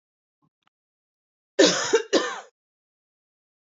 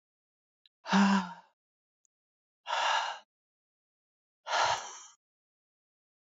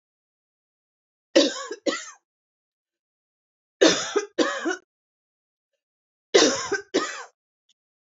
{"cough_length": "3.8 s", "cough_amplitude": 25458, "cough_signal_mean_std_ratio": 0.29, "exhalation_length": "6.2 s", "exhalation_amplitude": 6728, "exhalation_signal_mean_std_ratio": 0.35, "three_cough_length": "8.0 s", "three_cough_amplitude": 24481, "three_cough_signal_mean_std_ratio": 0.32, "survey_phase": "beta (2021-08-13 to 2022-03-07)", "age": "45-64", "gender": "Female", "wearing_mask": "No", "symptom_none": true, "smoker_status": "Never smoked", "respiratory_condition_asthma": false, "respiratory_condition_other": false, "recruitment_source": "REACT", "submission_delay": "3 days", "covid_test_result": "Negative", "covid_test_method": "RT-qPCR", "influenza_a_test_result": "Negative", "influenza_b_test_result": "Negative"}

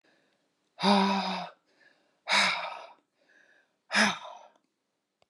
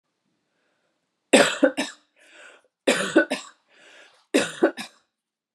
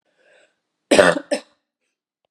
{"exhalation_length": "5.3 s", "exhalation_amplitude": 10150, "exhalation_signal_mean_std_ratio": 0.4, "three_cough_length": "5.5 s", "three_cough_amplitude": 29526, "three_cough_signal_mean_std_ratio": 0.32, "cough_length": "2.3 s", "cough_amplitude": 32768, "cough_signal_mean_std_ratio": 0.27, "survey_phase": "beta (2021-08-13 to 2022-03-07)", "age": "45-64", "gender": "Female", "wearing_mask": "No", "symptom_cough_any": true, "symptom_other": true, "symptom_onset": "2 days", "smoker_status": "Ex-smoker", "respiratory_condition_asthma": false, "respiratory_condition_other": false, "recruitment_source": "Test and Trace", "submission_delay": "1 day", "covid_test_result": "Positive", "covid_test_method": "ePCR"}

